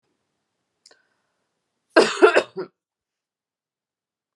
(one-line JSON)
{"cough_length": "4.4 s", "cough_amplitude": 29583, "cough_signal_mean_std_ratio": 0.22, "survey_phase": "alpha (2021-03-01 to 2021-08-12)", "age": "45-64", "gender": "Female", "wearing_mask": "No", "symptom_shortness_of_breath": true, "smoker_status": "Current smoker (1 to 10 cigarettes per day)", "respiratory_condition_asthma": false, "respiratory_condition_other": false, "recruitment_source": "REACT", "submission_delay": "3 days", "covid_test_result": "Negative", "covid_test_method": "RT-qPCR"}